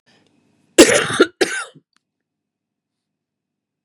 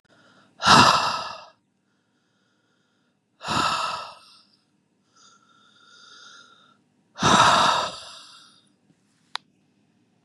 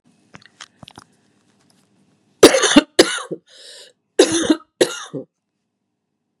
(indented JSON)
{
  "cough_length": "3.8 s",
  "cough_amplitude": 32768,
  "cough_signal_mean_std_ratio": 0.26,
  "exhalation_length": "10.2 s",
  "exhalation_amplitude": 27296,
  "exhalation_signal_mean_std_ratio": 0.33,
  "three_cough_length": "6.4 s",
  "three_cough_amplitude": 32768,
  "three_cough_signal_mean_std_ratio": 0.28,
  "survey_phase": "beta (2021-08-13 to 2022-03-07)",
  "age": "45-64",
  "gender": "Female",
  "wearing_mask": "No",
  "symptom_cough_any": true,
  "symptom_runny_or_blocked_nose": true,
  "symptom_diarrhoea": true,
  "symptom_headache": true,
  "smoker_status": "Ex-smoker",
  "respiratory_condition_asthma": false,
  "respiratory_condition_other": false,
  "recruitment_source": "Test and Trace",
  "submission_delay": "1 day",
  "covid_test_result": "Positive",
  "covid_test_method": "RT-qPCR"
}